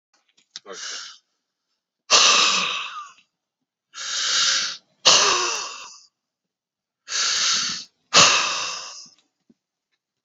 {"exhalation_length": "10.2 s", "exhalation_amplitude": 32721, "exhalation_signal_mean_std_ratio": 0.46, "survey_phase": "beta (2021-08-13 to 2022-03-07)", "age": "65+", "gender": "Male", "wearing_mask": "No", "symptom_none": true, "smoker_status": "Ex-smoker", "respiratory_condition_asthma": false, "respiratory_condition_other": false, "recruitment_source": "REACT", "submission_delay": "5 days", "covid_test_result": "Negative", "covid_test_method": "RT-qPCR"}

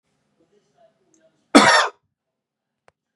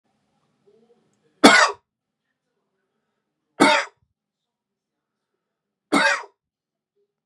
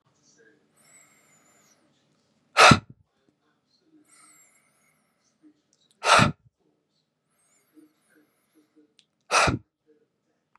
{"cough_length": "3.2 s", "cough_amplitude": 32768, "cough_signal_mean_std_ratio": 0.25, "three_cough_length": "7.3 s", "three_cough_amplitude": 32768, "three_cough_signal_mean_std_ratio": 0.24, "exhalation_length": "10.6 s", "exhalation_amplitude": 29349, "exhalation_signal_mean_std_ratio": 0.2, "survey_phase": "beta (2021-08-13 to 2022-03-07)", "age": "45-64", "gender": "Male", "wearing_mask": "No", "symptom_none": true, "smoker_status": "Current smoker (e-cigarettes or vapes only)", "respiratory_condition_asthma": false, "respiratory_condition_other": false, "recruitment_source": "REACT", "submission_delay": "1 day", "covid_test_result": "Negative", "covid_test_method": "RT-qPCR", "influenza_a_test_result": "Negative", "influenza_b_test_result": "Negative"}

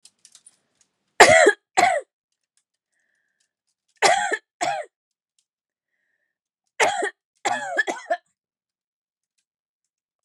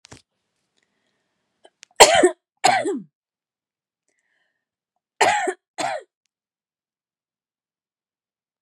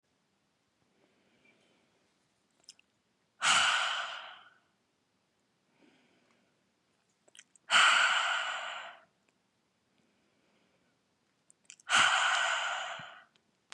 {"three_cough_length": "10.2 s", "three_cough_amplitude": 32768, "three_cough_signal_mean_std_ratio": 0.29, "cough_length": "8.6 s", "cough_amplitude": 32768, "cough_signal_mean_std_ratio": 0.24, "exhalation_length": "13.7 s", "exhalation_amplitude": 8760, "exhalation_signal_mean_std_ratio": 0.36, "survey_phase": "beta (2021-08-13 to 2022-03-07)", "age": "18-44", "gender": "Female", "wearing_mask": "No", "symptom_none": true, "smoker_status": "Ex-smoker", "respiratory_condition_asthma": false, "respiratory_condition_other": false, "recruitment_source": "REACT", "submission_delay": "1 day", "covid_test_result": "Negative", "covid_test_method": "RT-qPCR", "influenza_a_test_result": "Negative", "influenza_b_test_result": "Negative"}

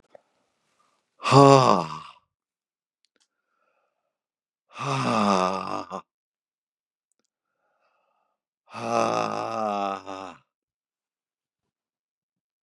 {"exhalation_length": "12.6 s", "exhalation_amplitude": 28080, "exhalation_signal_mean_std_ratio": 0.29, "survey_phase": "beta (2021-08-13 to 2022-03-07)", "age": "45-64", "gender": "Male", "wearing_mask": "No", "symptom_new_continuous_cough": true, "symptom_fatigue": true, "symptom_fever_high_temperature": true, "symptom_headache": true, "symptom_other": true, "symptom_onset": "2 days", "smoker_status": "Never smoked", "respiratory_condition_asthma": false, "respiratory_condition_other": false, "recruitment_source": "Test and Trace", "submission_delay": "2 days", "covid_test_result": "Positive", "covid_test_method": "RT-qPCR", "covid_ct_value": 26.7, "covid_ct_gene": "ORF1ab gene"}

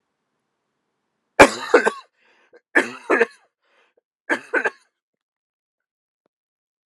{"three_cough_length": "6.9 s", "three_cough_amplitude": 32768, "three_cough_signal_mean_std_ratio": 0.23, "survey_phase": "alpha (2021-03-01 to 2021-08-12)", "age": "18-44", "gender": "Male", "wearing_mask": "No", "symptom_cough_any": true, "symptom_headache": true, "symptom_change_to_sense_of_smell_or_taste": true, "symptom_onset": "4 days", "smoker_status": "Never smoked", "respiratory_condition_asthma": true, "respiratory_condition_other": false, "recruitment_source": "Test and Trace", "submission_delay": "2 days", "covid_test_result": "Positive", "covid_test_method": "RT-qPCR", "covid_ct_value": 15.1, "covid_ct_gene": "ORF1ab gene", "covid_ct_mean": 16.3, "covid_viral_load": "4400000 copies/ml", "covid_viral_load_category": "High viral load (>1M copies/ml)"}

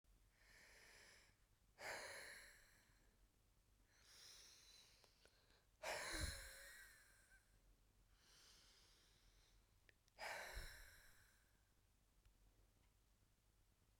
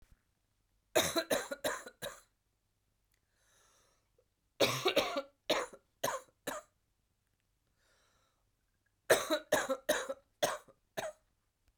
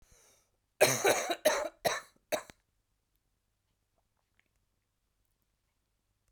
{"exhalation_length": "14.0 s", "exhalation_amplitude": 495, "exhalation_signal_mean_std_ratio": 0.47, "three_cough_length": "11.8 s", "three_cough_amplitude": 7257, "three_cough_signal_mean_std_ratio": 0.35, "cough_length": "6.3 s", "cough_amplitude": 11418, "cough_signal_mean_std_ratio": 0.28, "survey_phase": "beta (2021-08-13 to 2022-03-07)", "age": "45-64", "gender": "Female", "wearing_mask": "No", "symptom_cough_any": true, "symptom_new_continuous_cough": true, "symptom_runny_or_blocked_nose": true, "symptom_shortness_of_breath": true, "symptom_sore_throat": true, "symptom_fatigue": true, "symptom_headache": true, "symptom_change_to_sense_of_smell_or_taste": true, "symptom_loss_of_taste": true, "symptom_other": true, "symptom_onset": "8 days", "smoker_status": "Ex-smoker", "respiratory_condition_asthma": false, "respiratory_condition_other": false, "recruitment_source": "Test and Trace", "submission_delay": "2 days", "covid_test_result": "Positive", "covid_test_method": "RT-qPCR", "covid_ct_value": 16.5, "covid_ct_gene": "ORF1ab gene", "covid_ct_mean": 16.9, "covid_viral_load": "2900000 copies/ml", "covid_viral_load_category": "High viral load (>1M copies/ml)"}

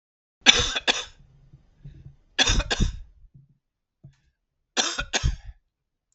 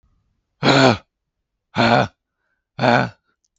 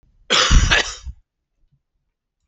{"three_cough_length": "6.1 s", "three_cough_amplitude": 32768, "three_cough_signal_mean_std_ratio": 0.35, "exhalation_length": "3.6 s", "exhalation_amplitude": 32768, "exhalation_signal_mean_std_ratio": 0.39, "cough_length": "2.5 s", "cough_amplitude": 32768, "cough_signal_mean_std_ratio": 0.39, "survey_phase": "beta (2021-08-13 to 2022-03-07)", "age": "45-64", "gender": "Male", "wearing_mask": "No", "symptom_diarrhoea": true, "symptom_fatigue": true, "symptom_headache": true, "symptom_onset": "8 days", "smoker_status": "Ex-smoker", "respiratory_condition_asthma": false, "respiratory_condition_other": false, "recruitment_source": "REACT", "submission_delay": "7 days", "covid_test_result": "Negative", "covid_test_method": "RT-qPCR", "influenza_a_test_result": "Negative", "influenza_b_test_result": "Negative"}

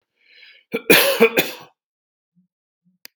{"cough_length": "3.2 s", "cough_amplitude": 32767, "cough_signal_mean_std_ratio": 0.32, "survey_phase": "beta (2021-08-13 to 2022-03-07)", "age": "65+", "gender": "Male", "wearing_mask": "No", "symptom_none": true, "smoker_status": "Never smoked", "respiratory_condition_asthma": false, "respiratory_condition_other": false, "recruitment_source": "REACT", "submission_delay": "4 days", "covid_test_result": "Negative", "covid_test_method": "RT-qPCR"}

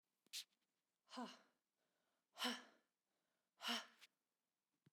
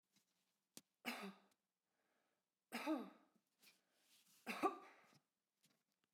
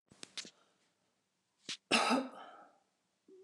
{"exhalation_length": "4.9 s", "exhalation_amplitude": 777, "exhalation_signal_mean_std_ratio": 0.3, "three_cough_length": "6.1 s", "three_cough_amplitude": 1617, "three_cough_signal_mean_std_ratio": 0.29, "cough_length": "3.4 s", "cough_amplitude": 4933, "cough_signal_mean_std_ratio": 0.31, "survey_phase": "alpha (2021-03-01 to 2021-08-12)", "age": "18-44", "gender": "Female", "wearing_mask": "No", "symptom_none": true, "smoker_status": "Never smoked", "respiratory_condition_asthma": false, "respiratory_condition_other": false, "recruitment_source": "REACT", "submission_delay": "1 day", "covid_test_result": "Negative", "covid_test_method": "RT-qPCR"}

